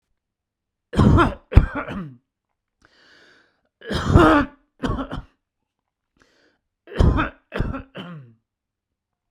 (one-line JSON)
{"three_cough_length": "9.3 s", "three_cough_amplitude": 32768, "three_cough_signal_mean_std_ratio": 0.34, "survey_phase": "beta (2021-08-13 to 2022-03-07)", "age": "45-64", "gender": "Male", "wearing_mask": "No", "symptom_none": true, "smoker_status": "Ex-smoker", "respiratory_condition_asthma": false, "respiratory_condition_other": false, "recruitment_source": "REACT", "submission_delay": "1 day", "covid_test_result": "Negative", "covid_test_method": "RT-qPCR"}